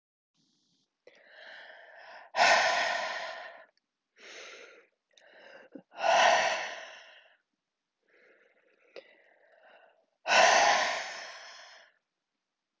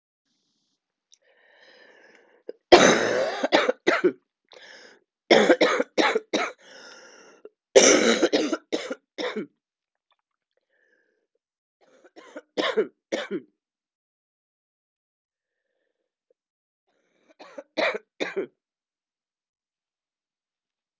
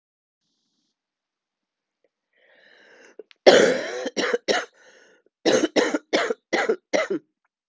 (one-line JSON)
{"exhalation_length": "12.8 s", "exhalation_amplitude": 10996, "exhalation_signal_mean_std_ratio": 0.37, "three_cough_length": "21.0 s", "three_cough_amplitude": 32767, "three_cough_signal_mean_std_ratio": 0.3, "cough_length": "7.7 s", "cough_amplitude": 32767, "cough_signal_mean_std_ratio": 0.36, "survey_phase": "alpha (2021-03-01 to 2021-08-12)", "age": "45-64", "gender": "Female", "wearing_mask": "No", "symptom_cough_any": true, "symptom_new_continuous_cough": true, "symptom_shortness_of_breath": true, "symptom_diarrhoea": true, "symptom_fatigue": true, "symptom_fever_high_temperature": true, "symptom_headache": true, "symptom_onset": "4 days", "smoker_status": "Never smoked", "respiratory_condition_asthma": false, "respiratory_condition_other": false, "recruitment_source": "Test and Trace", "submission_delay": "2 days", "covid_test_result": "Positive", "covid_test_method": "RT-qPCR"}